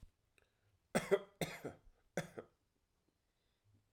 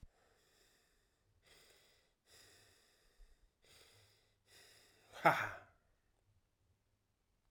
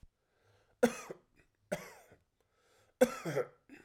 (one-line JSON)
{"cough_length": "3.9 s", "cough_amplitude": 3643, "cough_signal_mean_std_ratio": 0.25, "exhalation_length": "7.5 s", "exhalation_amplitude": 6266, "exhalation_signal_mean_std_ratio": 0.17, "three_cough_length": "3.8 s", "three_cough_amplitude": 7077, "three_cough_signal_mean_std_ratio": 0.26, "survey_phase": "alpha (2021-03-01 to 2021-08-12)", "age": "18-44", "gender": "Male", "wearing_mask": "No", "symptom_fatigue": true, "symptom_fever_high_temperature": true, "symptom_headache": true, "smoker_status": "Current smoker (e-cigarettes or vapes only)", "respiratory_condition_asthma": false, "respiratory_condition_other": false, "recruitment_source": "Test and Trace", "submission_delay": "2 days", "covid_test_result": "Positive", "covid_test_method": "RT-qPCR", "covid_ct_value": 14.8, "covid_ct_gene": "ORF1ab gene", "covid_ct_mean": 15.1, "covid_viral_load": "11000000 copies/ml", "covid_viral_load_category": "High viral load (>1M copies/ml)"}